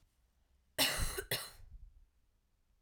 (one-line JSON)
{"cough_length": "2.8 s", "cough_amplitude": 4156, "cough_signal_mean_std_ratio": 0.39, "survey_phase": "alpha (2021-03-01 to 2021-08-12)", "age": "18-44", "gender": "Female", "wearing_mask": "No", "symptom_cough_any": true, "symptom_headache": true, "symptom_onset": "4 days", "smoker_status": "Never smoked", "respiratory_condition_asthma": false, "respiratory_condition_other": false, "recruitment_source": "Test and Trace", "submission_delay": "2 days", "covid_test_result": "Positive", "covid_test_method": "RT-qPCR", "covid_ct_value": 23.9, "covid_ct_gene": "ORF1ab gene", "covid_ct_mean": 24.5, "covid_viral_load": "9300 copies/ml", "covid_viral_load_category": "Minimal viral load (< 10K copies/ml)"}